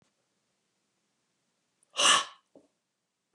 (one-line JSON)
{"exhalation_length": "3.3 s", "exhalation_amplitude": 11750, "exhalation_signal_mean_std_ratio": 0.22, "survey_phase": "beta (2021-08-13 to 2022-03-07)", "age": "45-64", "gender": "Male", "wearing_mask": "No", "symptom_none": true, "smoker_status": "Ex-smoker", "respiratory_condition_asthma": false, "respiratory_condition_other": false, "recruitment_source": "REACT", "submission_delay": "4 days", "covid_test_result": "Negative", "covid_test_method": "RT-qPCR", "influenza_a_test_result": "Negative", "influenza_b_test_result": "Negative"}